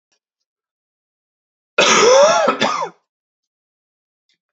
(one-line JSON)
{"cough_length": "4.5 s", "cough_amplitude": 32267, "cough_signal_mean_std_ratio": 0.39, "survey_phase": "beta (2021-08-13 to 2022-03-07)", "age": "18-44", "gender": "Male", "wearing_mask": "No", "symptom_fatigue": true, "symptom_change_to_sense_of_smell_or_taste": true, "symptom_other": true, "smoker_status": "Never smoked", "respiratory_condition_asthma": false, "respiratory_condition_other": false, "recruitment_source": "Test and Trace", "submission_delay": "2 days", "covid_test_result": "Positive", "covid_test_method": "LAMP"}